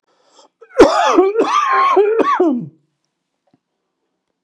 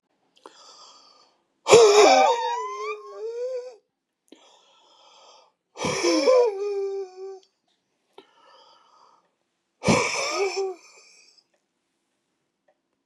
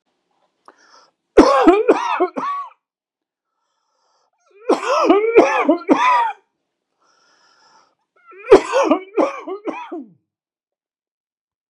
{
  "cough_length": "4.4 s",
  "cough_amplitude": 32768,
  "cough_signal_mean_std_ratio": 0.57,
  "exhalation_length": "13.1 s",
  "exhalation_amplitude": 30340,
  "exhalation_signal_mean_std_ratio": 0.39,
  "three_cough_length": "11.7 s",
  "three_cough_amplitude": 32768,
  "three_cough_signal_mean_std_ratio": 0.41,
  "survey_phase": "beta (2021-08-13 to 2022-03-07)",
  "age": "65+",
  "gender": "Male",
  "wearing_mask": "No",
  "symptom_none": true,
  "smoker_status": "Ex-smoker",
  "respiratory_condition_asthma": false,
  "respiratory_condition_other": false,
  "recruitment_source": "REACT",
  "submission_delay": "2 days",
  "covid_test_result": "Negative",
  "covid_test_method": "RT-qPCR",
  "influenza_a_test_result": "Negative",
  "influenza_b_test_result": "Negative"
}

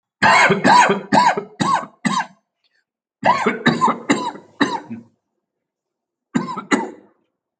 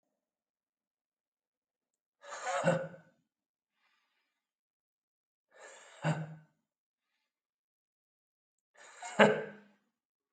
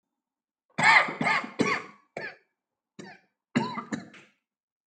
{
  "three_cough_length": "7.6 s",
  "three_cough_amplitude": 28161,
  "three_cough_signal_mean_std_ratio": 0.49,
  "exhalation_length": "10.3 s",
  "exhalation_amplitude": 16863,
  "exhalation_signal_mean_std_ratio": 0.22,
  "cough_length": "4.9 s",
  "cough_amplitude": 18171,
  "cough_signal_mean_std_ratio": 0.36,
  "survey_phase": "alpha (2021-03-01 to 2021-08-12)",
  "age": "18-44",
  "gender": "Male",
  "wearing_mask": "No",
  "symptom_headache": true,
  "symptom_onset": "8 days",
  "smoker_status": "Never smoked",
  "respiratory_condition_asthma": false,
  "respiratory_condition_other": false,
  "recruitment_source": "REACT",
  "submission_delay": "2 days",
  "covid_test_result": "Negative",
  "covid_test_method": "RT-qPCR"
}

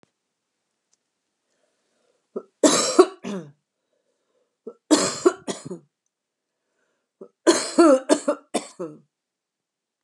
{
  "three_cough_length": "10.0 s",
  "three_cough_amplitude": 28731,
  "three_cough_signal_mean_std_ratio": 0.29,
  "survey_phase": "beta (2021-08-13 to 2022-03-07)",
  "age": "65+",
  "gender": "Female",
  "wearing_mask": "No",
  "symptom_none": true,
  "smoker_status": "Never smoked",
  "respiratory_condition_asthma": false,
  "respiratory_condition_other": false,
  "recruitment_source": "REACT",
  "submission_delay": "4 days",
  "covid_test_result": "Negative",
  "covid_test_method": "RT-qPCR",
  "influenza_a_test_result": "Negative",
  "influenza_b_test_result": "Negative"
}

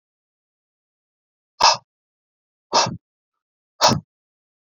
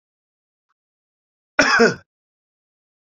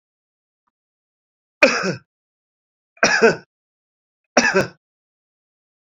{
  "exhalation_length": "4.7 s",
  "exhalation_amplitude": 28536,
  "exhalation_signal_mean_std_ratio": 0.25,
  "cough_length": "3.1 s",
  "cough_amplitude": 28014,
  "cough_signal_mean_std_ratio": 0.25,
  "three_cough_length": "5.9 s",
  "three_cough_amplitude": 32767,
  "three_cough_signal_mean_std_ratio": 0.28,
  "survey_phase": "beta (2021-08-13 to 2022-03-07)",
  "age": "45-64",
  "gender": "Male",
  "wearing_mask": "No",
  "symptom_none": true,
  "smoker_status": "Ex-smoker",
  "respiratory_condition_asthma": false,
  "respiratory_condition_other": false,
  "recruitment_source": "REACT",
  "submission_delay": "1 day",
  "covid_test_result": "Negative",
  "covid_test_method": "RT-qPCR"
}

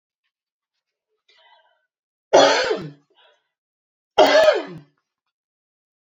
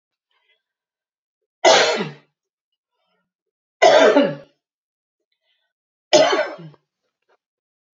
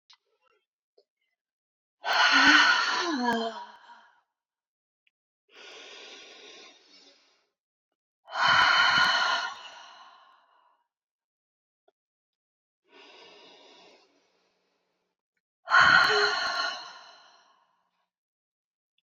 {
  "cough_length": "6.1 s",
  "cough_amplitude": 29631,
  "cough_signal_mean_std_ratio": 0.3,
  "three_cough_length": "7.9 s",
  "three_cough_amplitude": 28613,
  "three_cough_signal_mean_std_ratio": 0.31,
  "exhalation_length": "19.0 s",
  "exhalation_amplitude": 16092,
  "exhalation_signal_mean_std_ratio": 0.36,
  "survey_phase": "alpha (2021-03-01 to 2021-08-12)",
  "age": "45-64",
  "gender": "Female",
  "wearing_mask": "No",
  "symptom_fatigue": true,
  "symptom_headache": true,
  "symptom_change_to_sense_of_smell_or_taste": true,
  "symptom_onset": "2 days",
  "smoker_status": "Never smoked",
  "respiratory_condition_asthma": false,
  "respiratory_condition_other": false,
  "recruitment_source": "Test and Trace",
  "submission_delay": "2 days",
  "covid_test_result": "Positive",
  "covid_test_method": "RT-qPCR",
  "covid_ct_value": 15.9,
  "covid_ct_gene": "ORF1ab gene",
  "covid_ct_mean": 16.3,
  "covid_viral_load": "4500000 copies/ml",
  "covid_viral_load_category": "High viral load (>1M copies/ml)"
}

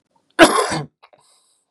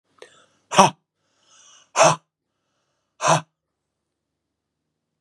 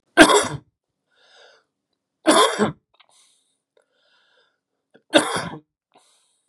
{
  "cough_length": "1.7 s",
  "cough_amplitude": 32768,
  "cough_signal_mean_std_ratio": 0.33,
  "exhalation_length": "5.2 s",
  "exhalation_amplitude": 32767,
  "exhalation_signal_mean_std_ratio": 0.24,
  "three_cough_length": "6.5 s",
  "three_cough_amplitude": 32768,
  "three_cough_signal_mean_std_ratio": 0.28,
  "survey_phase": "beta (2021-08-13 to 2022-03-07)",
  "age": "45-64",
  "gender": "Male",
  "wearing_mask": "No",
  "symptom_runny_or_blocked_nose": true,
  "smoker_status": "Current smoker (1 to 10 cigarettes per day)",
  "respiratory_condition_asthma": false,
  "respiratory_condition_other": false,
  "recruitment_source": "Test and Trace",
  "submission_delay": "2 days",
  "covid_test_result": "Positive",
  "covid_test_method": "LFT"
}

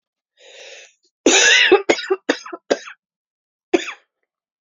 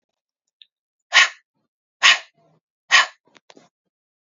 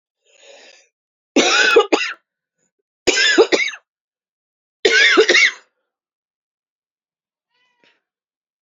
{
  "cough_length": "4.6 s",
  "cough_amplitude": 30650,
  "cough_signal_mean_std_ratio": 0.37,
  "exhalation_length": "4.4 s",
  "exhalation_amplitude": 32048,
  "exhalation_signal_mean_std_ratio": 0.24,
  "three_cough_length": "8.6 s",
  "three_cough_amplitude": 32468,
  "three_cough_signal_mean_std_ratio": 0.38,
  "survey_phase": "beta (2021-08-13 to 2022-03-07)",
  "age": "18-44",
  "gender": "Female",
  "wearing_mask": "No",
  "symptom_new_continuous_cough": true,
  "symptom_runny_or_blocked_nose": true,
  "symptom_shortness_of_breath": true,
  "symptom_diarrhoea": true,
  "symptom_fatigue": true,
  "symptom_fever_high_temperature": true,
  "symptom_change_to_sense_of_smell_or_taste": true,
  "symptom_loss_of_taste": true,
  "symptom_onset": "2 days",
  "smoker_status": "Current smoker (e-cigarettes or vapes only)",
  "respiratory_condition_asthma": true,
  "respiratory_condition_other": false,
  "recruitment_source": "Test and Trace",
  "submission_delay": "2 days",
  "covid_test_result": "Positive",
  "covid_test_method": "RT-qPCR",
  "covid_ct_value": 16.1,
  "covid_ct_gene": "ORF1ab gene",
  "covid_ct_mean": 16.5,
  "covid_viral_load": "3900000 copies/ml",
  "covid_viral_load_category": "High viral load (>1M copies/ml)"
}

